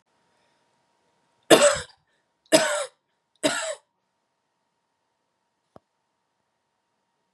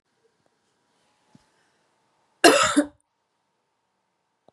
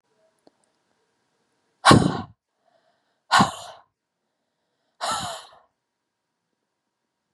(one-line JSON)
{"three_cough_length": "7.3 s", "three_cough_amplitude": 32767, "three_cough_signal_mean_std_ratio": 0.23, "cough_length": "4.5 s", "cough_amplitude": 31859, "cough_signal_mean_std_ratio": 0.22, "exhalation_length": "7.3 s", "exhalation_amplitude": 31428, "exhalation_signal_mean_std_ratio": 0.22, "survey_phase": "beta (2021-08-13 to 2022-03-07)", "age": "18-44", "gender": "Female", "wearing_mask": "No", "symptom_runny_or_blocked_nose": true, "symptom_sore_throat": true, "symptom_fatigue": true, "symptom_headache": true, "symptom_change_to_sense_of_smell_or_taste": true, "symptom_loss_of_taste": true, "smoker_status": "Never smoked", "respiratory_condition_asthma": false, "respiratory_condition_other": false, "recruitment_source": "Test and Trace", "submission_delay": "2 days", "covid_test_result": "Positive", "covid_test_method": "RT-qPCR", "covid_ct_value": 24.7, "covid_ct_gene": "ORF1ab gene", "covid_ct_mean": 25.6, "covid_viral_load": "4100 copies/ml", "covid_viral_load_category": "Minimal viral load (< 10K copies/ml)"}